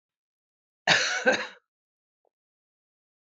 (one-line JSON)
{"cough_length": "3.3 s", "cough_amplitude": 17841, "cough_signal_mean_std_ratio": 0.3, "survey_phase": "beta (2021-08-13 to 2022-03-07)", "age": "45-64", "gender": "Female", "wearing_mask": "No", "symptom_cough_any": true, "symptom_runny_or_blocked_nose": true, "symptom_sore_throat": true, "symptom_headache": true, "symptom_change_to_sense_of_smell_or_taste": true, "symptom_loss_of_taste": true, "smoker_status": "Never smoked", "respiratory_condition_asthma": false, "respiratory_condition_other": false, "recruitment_source": "Test and Trace", "submission_delay": "1 day", "covid_test_result": "Positive", "covid_test_method": "RT-qPCR", "covid_ct_value": 16.5, "covid_ct_gene": "ORF1ab gene", "covid_ct_mean": 16.7, "covid_viral_load": "3200000 copies/ml", "covid_viral_load_category": "High viral load (>1M copies/ml)"}